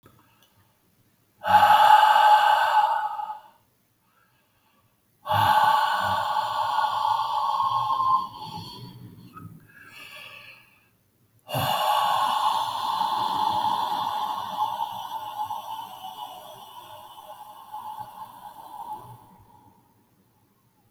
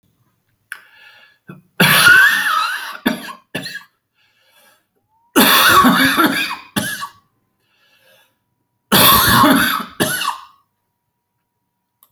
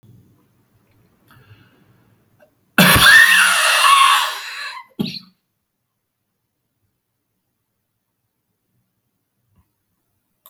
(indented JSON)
{
  "exhalation_length": "20.9 s",
  "exhalation_amplitude": 19219,
  "exhalation_signal_mean_std_ratio": 0.57,
  "three_cough_length": "12.1 s",
  "three_cough_amplitude": 32768,
  "three_cough_signal_mean_std_ratio": 0.47,
  "cough_length": "10.5 s",
  "cough_amplitude": 32768,
  "cough_signal_mean_std_ratio": 0.33,
  "survey_phase": "beta (2021-08-13 to 2022-03-07)",
  "age": "45-64",
  "gender": "Male",
  "wearing_mask": "No",
  "symptom_new_continuous_cough": true,
  "symptom_fatigue": true,
  "symptom_change_to_sense_of_smell_or_taste": true,
  "symptom_onset": "8 days",
  "smoker_status": "Ex-smoker",
  "respiratory_condition_asthma": false,
  "respiratory_condition_other": false,
  "recruitment_source": "Test and Trace",
  "submission_delay": "2 days",
  "covid_test_result": "Positive",
  "covid_test_method": "RT-qPCR"
}